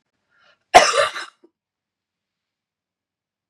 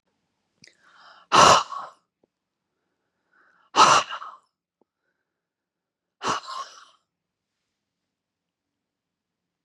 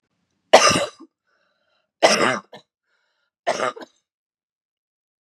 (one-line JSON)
{"cough_length": "3.5 s", "cough_amplitude": 32768, "cough_signal_mean_std_ratio": 0.22, "exhalation_length": "9.6 s", "exhalation_amplitude": 28934, "exhalation_signal_mean_std_ratio": 0.23, "three_cough_length": "5.2 s", "three_cough_amplitude": 32768, "three_cough_signal_mean_std_ratio": 0.29, "survey_phase": "beta (2021-08-13 to 2022-03-07)", "age": "45-64", "gender": "Female", "wearing_mask": "No", "symptom_cough_any": true, "symptom_shortness_of_breath": true, "symptom_fatigue": true, "smoker_status": "Never smoked", "respiratory_condition_asthma": true, "respiratory_condition_other": false, "recruitment_source": "REACT", "submission_delay": "1 day", "covid_test_result": "Negative", "covid_test_method": "RT-qPCR", "influenza_a_test_result": "Negative", "influenza_b_test_result": "Negative"}